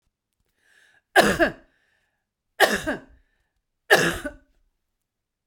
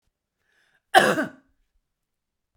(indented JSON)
{
  "three_cough_length": "5.5 s",
  "three_cough_amplitude": 27378,
  "three_cough_signal_mean_std_ratio": 0.3,
  "cough_length": "2.6 s",
  "cough_amplitude": 31415,
  "cough_signal_mean_std_ratio": 0.24,
  "survey_phase": "beta (2021-08-13 to 2022-03-07)",
  "age": "65+",
  "gender": "Female",
  "wearing_mask": "No",
  "symptom_none": true,
  "smoker_status": "Never smoked",
  "respiratory_condition_asthma": false,
  "respiratory_condition_other": false,
  "recruitment_source": "REACT",
  "submission_delay": "1 day",
  "covid_test_result": "Negative",
  "covid_test_method": "RT-qPCR"
}